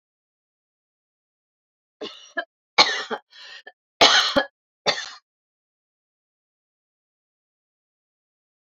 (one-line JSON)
{"cough_length": "8.7 s", "cough_amplitude": 31808, "cough_signal_mean_std_ratio": 0.23, "survey_phase": "alpha (2021-03-01 to 2021-08-12)", "age": "45-64", "gender": "Female", "wearing_mask": "No", "symptom_none": true, "smoker_status": "Ex-smoker", "respiratory_condition_asthma": true, "respiratory_condition_other": false, "recruitment_source": "REACT", "submission_delay": "3 days", "covid_test_result": "Negative", "covid_test_method": "RT-qPCR"}